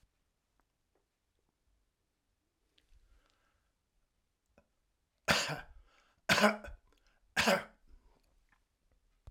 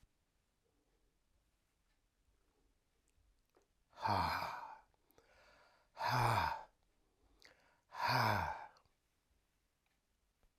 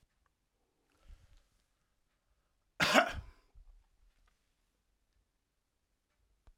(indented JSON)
{
  "three_cough_length": "9.3 s",
  "three_cough_amplitude": 9575,
  "three_cough_signal_mean_std_ratio": 0.23,
  "exhalation_length": "10.6 s",
  "exhalation_amplitude": 2948,
  "exhalation_signal_mean_std_ratio": 0.35,
  "cough_length": "6.6 s",
  "cough_amplitude": 11673,
  "cough_signal_mean_std_ratio": 0.18,
  "survey_phase": "alpha (2021-03-01 to 2021-08-12)",
  "age": "65+",
  "gender": "Male",
  "wearing_mask": "No",
  "symptom_change_to_sense_of_smell_or_taste": true,
  "smoker_status": "Ex-smoker",
  "respiratory_condition_asthma": false,
  "respiratory_condition_other": false,
  "recruitment_source": "REACT",
  "submission_delay": "2 days",
  "covid_test_result": "Negative",
  "covid_test_method": "RT-qPCR"
}